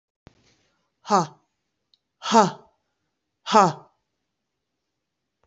{"exhalation_length": "5.5 s", "exhalation_amplitude": 24909, "exhalation_signal_mean_std_ratio": 0.25, "survey_phase": "beta (2021-08-13 to 2022-03-07)", "age": "45-64", "gender": "Female", "wearing_mask": "No", "symptom_runny_or_blocked_nose": true, "symptom_diarrhoea": true, "symptom_fatigue": true, "smoker_status": "Never smoked", "respiratory_condition_asthma": false, "respiratory_condition_other": false, "recruitment_source": "Test and Trace", "submission_delay": "2 days", "covid_test_result": "Positive", "covid_test_method": "RT-qPCR", "covid_ct_value": 19.2, "covid_ct_gene": "ORF1ab gene"}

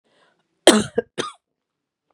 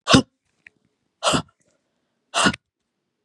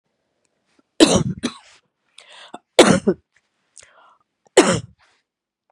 {"cough_length": "2.1 s", "cough_amplitude": 32768, "cough_signal_mean_std_ratio": 0.24, "exhalation_length": "3.2 s", "exhalation_amplitude": 32083, "exhalation_signal_mean_std_ratio": 0.29, "three_cough_length": "5.7 s", "three_cough_amplitude": 32768, "three_cough_signal_mean_std_ratio": 0.28, "survey_phase": "beta (2021-08-13 to 2022-03-07)", "age": "45-64", "gender": "Female", "wearing_mask": "No", "symptom_runny_or_blocked_nose": true, "symptom_other": true, "symptom_onset": "3 days", "smoker_status": "Never smoked", "respiratory_condition_asthma": true, "respiratory_condition_other": false, "recruitment_source": "Test and Trace", "submission_delay": "1 day", "covid_test_result": "Positive", "covid_test_method": "RT-qPCR", "covid_ct_value": 24.6, "covid_ct_gene": "N gene"}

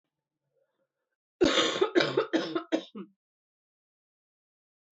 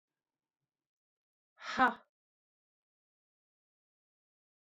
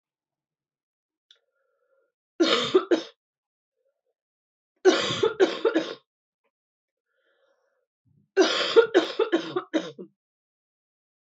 {"cough_length": "4.9 s", "cough_amplitude": 12187, "cough_signal_mean_std_ratio": 0.36, "exhalation_length": "4.8 s", "exhalation_amplitude": 5743, "exhalation_signal_mean_std_ratio": 0.15, "three_cough_length": "11.3 s", "three_cough_amplitude": 17568, "three_cough_signal_mean_std_ratio": 0.34, "survey_phase": "beta (2021-08-13 to 2022-03-07)", "age": "45-64", "gender": "Female", "wearing_mask": "No", "symptom_cough_any": true, "symptom_runny_or_blocked_nose": true, "symptom_fever_high_temperature": true, "symptom_loss_of_taste": true, "smoker_status": "Never smoked", "respiratory_condition_asthma": false, "respiratory_condition_other": false, "recruitment_source": "Test and Trace", "submission_delay": "2 days", "covid_test_result": "Positive", "covid_test_method": "RT-qPCR", "covid_ct_value": 21.0, "covid_ct_gene": "N gene"}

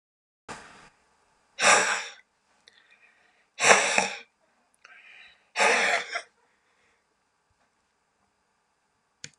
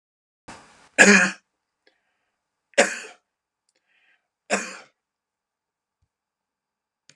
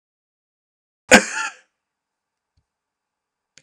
{"exhalation_length": "9.4 s", "exhalation_amplitude": 28043, "exhalation_signal_mean_std_ratio": 0.31, "three_cough_length": "7.2 s", "three_cough_amplitude": 31966, "three_cough_signal_mean_std_ratio": 0.21, "cough_length": "3.6 s", "cough_amplitude": 32768, "cough_signal_mean_std_ratio": 0.17, "survey_phase": "beta (2021-08-13 to 2022-03-07)", "age": "65+", "gender": "Male", "wearing_mask": "No", "symptom_none": true, "smoker_status": "Ex-smoker", "respiratory_condition_asthma": false, "respiratory_condition_other": true, "recruitment_source": "REACT", "submission_delay": "3 days", "covid_test_result": "Negative", "covid_test_method": "RT-qPCR"}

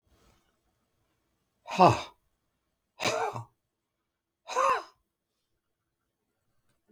{"exhalation_length": "6.9 s", "exhalation_amplitude": 18090, "exhalation_signal_mean_std_ratio": 0.25, "survey_phase": "beta (2021-08-13 to 2022-03-07)", "age": "65+", "gender": "Male", "wearing_mask": "No", "symptom_cough_any": true, "smoker_status": "Never smoked", "respiratory_condition_asthma": false, "respiratory_condition_other": false, "recruitment_source": "REACT", "submission_delay": "2 days", "covid_test_result": "Negative", "covid_test_method": "RT-qPCR", "influenza_a_test_result": "Negative", "influenza_b_test_result": "Negative"}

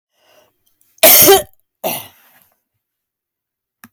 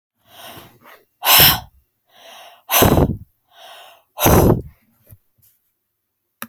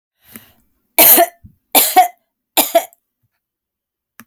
{"cough_length": "3.9 s", "cough_amplitude": 32768, "cough_signal_mean_std_ratio": 0.29, "exhalation_length": "6.5 s", "exhalation_amplitude": 32768, "exhalation_signal_mean_std_ratio": 0.36, "three_cough_length": "4.3 s", "three_cough_amplitude": 32768, "three_cough_signal_mean_std_ratio": 0.34, "survey_phase": "alpha (2021-03-01 to 2021-08-12)", "age": "45-64", "gender": "Female", "wearing_mask": "No", "symptom_none": true, "smoker_status": "Ex-smoker", "respiratory_condition_asthma": false, "respiratory_condition_other": false, "recruitment_source": "REACT", "submission_delay": "2 days", "covid_test_result": "Negative", "covid_test_method": "RT-qPCR"}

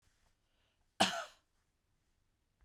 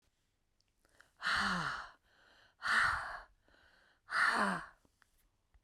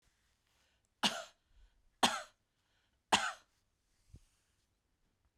{"cough_length": "2.6 s", "cough_amplitude": 5143, "cough_signal_mean_std_ratio": 0.21, "exhalation_length": "5.6 s", "exhalation_amplitude": 3975, "exhalation_signal_mean_std_ratio": 0.45, "three_cough_length": "5.4 s", "three_cough_amplitude": 6999, "three_cough_signal_mean_std_ratio": 0.22, "survey_phase": "beta (2021-08-13 to 2022-03-07)", "age": "65+", "gender": "Female", "wearing_mask": "No", "symptom_cough_any": true, "symptom_change_to_sense_of_smell_or_taste": true, "smoker_status": "Never smoked", "respiratory_condition_asthma": true, "respiratory_condition_other": false, "recruitment_source": "REACT", "submission_delay": "4 days", "covid_test_result": "Negative", "covid_test_method": "RT-qPCR"}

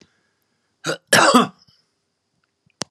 {"cough_length": "2.9 s", "cough_amplitude": 32758, "cough_signal_mean_std_ratio": 0.29, "survey_phase": "beta (2021-08-13 to 2022-03-07)", "age": "65+", "gender": "Male", "wearing_mask": "No", "symptom_none": true, "smoker_status": "Ex-smoker", "respiratory_condition_asthma": false, "respiratory_condition_other": false, "recruitment_source": "Test and Trace", "submission_delay": "2 days", "covid_test_result": "Negative", "covid_test_method": "RT-qPCR"}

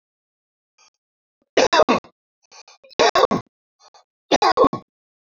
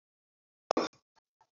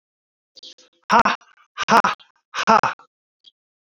{"three_cough_length": "5.3 s", "three_cough_amplitude": 28459, "three_cough_signal_mean_std_ratio": 0.33, "cough_length": "1.5 s", "cough_amplitude": 9705, "cough_signal_mean_std_ratio": 0.18, "exhalation_length": "3.9 s", "exhalation_amplitude": 28199, "exhalation_signal_mean_std_ratio": 0.32, "survey_phase": "alpha (2021-03-01 to 2021-08-12)", "age": "45-64", "gender": "Male", "wearing_mask": "No", "symptom_none": true, "smoker_status": "Never smoked", "respiratory_condition_asthma": false, "respiratory_condition_other": false, "recruitment_source": "REACT", "submission_delay": "3 days", "covid_test_result": "Negative", "covid_test_method": "RT-qPCR"}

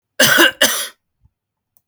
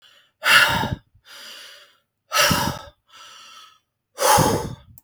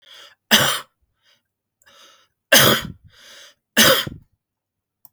{"cough_length": "1.9 s", "cough_amplitude": 32768, "cough_signal_mean_std_ratio": 0.42, "exhalation_length": "5.0 s", "exhalation_amplitude": 32766, "exhalation_signal_mean_std_ratio": 0.44, "three_cough_length": "5.1 s", "three_cough_amplitude": 32768, "three_cough_signal_mean_std_ratio": 0.32, "survey_phase": "beta (2021-08-13 to 2022-03-07)", "age": "45-64", "gender": "Male", "wearing_mask": "No", "symptom_runny_or_blocked_nose": true, "symptom_sore_throat": true, "symptom_onset": "8 days", "smoker_status": "Never smoked", "respiratory_condition_asthma": false, "respiratory_condition_other": false, "recruitment_source": "REACT", "submission_delay": "1 day", "covid_test_result": "Negative", "covid_test_method": "RT-qPCR", "influenza_a_test_result": "Negative", "influenza_b_test_result": "Negative"}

